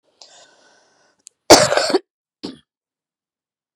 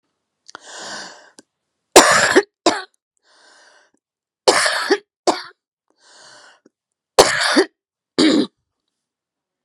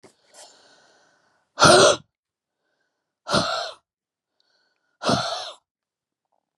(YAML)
cough_length: 3.8 s
cough_amplitude: 32768
cough_signal_mean_std_ratio: 0.24
three_cough_length: 9.6 s
three_cough_amplitude: 32768
three_cough_signal_mean_std_ratio: 0.33
exhalation_length: 6.6 s
exhalation_amplitude: 30087
exhalation_signal_mean_std_ratio: 0.29
survey_phase: beta (2021-08-13 to 2022-03-07)
age: 45-64
gender: Female
wearing_mask: 'No'
symptom_cough_any: true
symptom_runny_or_blocked_nose: true
symptom_shortness_of_breath: true
symptom_fatigue: true
symptom_fever_high_temperature: true
symptom_onset: 3 days
smoker_status: Never smoked
respiratory_condition_asthma: false
respiratory_condition_other: false
recruitment_source: Test and Trace
submission_delay: 2 days
covid_test_result: Positive
covid_test_method: RT-qPCR
covid_ct_value: 20.0
covid_ct_gene: ORF1ab gene
covid_ct_mean: 21.0
covid_viral_load: 130000 copies/ml
covid_viral_load_category: Low viral load (10K-1M copies/ml)